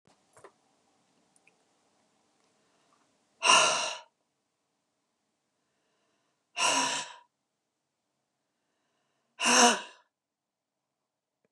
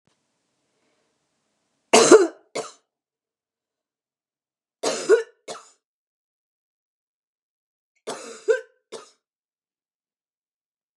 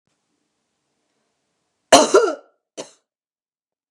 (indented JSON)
{
  "exhalation_length": "11.5 s",
  "exhalation_amplitude": 15435,
  "exhalation_signal_mean_std_ratio": 0.26,
  "three_cough_length": "11.0 s",
  "three_cough_amplitude": 32687,
  "three_cough_signal_mean_std_ratio": 0.2,
  "cough_length": "3.9 s",
  "cough_amplitude": 32768,
  "cough_signal_mean_std_ratio": 0.23,
  "survey_phase": "beta (2021-08-13 to 2022-03-07)",
  "age": "65+",
  "gender": "Female",
  "wearing_mask": "No",
  "symptom_none": true,
  "smoker_status": "Never smoked",
  "respiratory_condition_asthma": false,
  "respiratory_condition_other": false,
  "recruitment_source": "REACT",
  "submission_delay": "1 day",
  "covid_test_result": "Negative",
  "covid_test_method": "RT-qPCR",
  "influenza_a_test_result": "Negative",
  "influenza_b_test_result": "Negative"
}